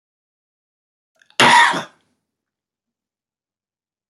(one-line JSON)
{"cough_length": "4.1 s", "cough_amplitude": 30879, "cough_signal_mean_std_ratio": 0.25, "survey_phase": "beta (2021-08-13 to 2022-03-07)", "age": "65+", "gender": "Male", "wearing_mask": "No", "symptom_cough_any": true, "smoker_status": "Never smoked", "recruitment_source": "REACT", "submission_delay": "2 days", "covid_test_result": "Negative", "covid_test_method": "RT-qPCR", "influenza_a_test_result": "Negative", "influenza_b_test_result": "Negative"}